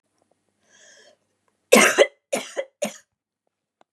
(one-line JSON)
{"three_cough_length": "3.9 s", "three_cough_amplitude": 32764, "three_cough_signal_mean_std_ratio": 0.26, "survey_phase": "beta (2021-08-13 to 2022-03-07)", "age": "45-64", "gender": "Female", "wearing_mask": "No", "symptom_none": true, "smoker_status": "Never smoked", "respiratory_condition_asthma": false, "respiratory_condition_other": false, "recruitment_source": "REACT", "submission_delay": "2 days", "covid_test_result": "Negative", "covid_test_method": "RT-qPCR", "influenza_a_test_result": "Negative", "influenza_b_test_result": "Negative"}